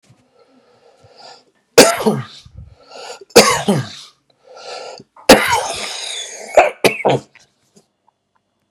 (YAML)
three_cough_length: 8.7 s
three_cough_amplitude: 32768
three_cough_signal_mean_std_ratio: 0.35
survey_phase: beta (2021-08-13 to 2022-03-07)
age: 45-64
gender: Male
wearing_mask: 'Yes'
symptom_shortness_of_breath: true
symptom_fatigue: true
smoker_status: Ex-smoker
respiratory_condition_asthma: false
respiratory_condition_other: false
recruitment_source: REACT
submission_delay: 20 days
covid_test_result: Negative
covid_test_method: RT-qPCR
influenza_a_test_result: Negative
influenza_b_test_result: Negative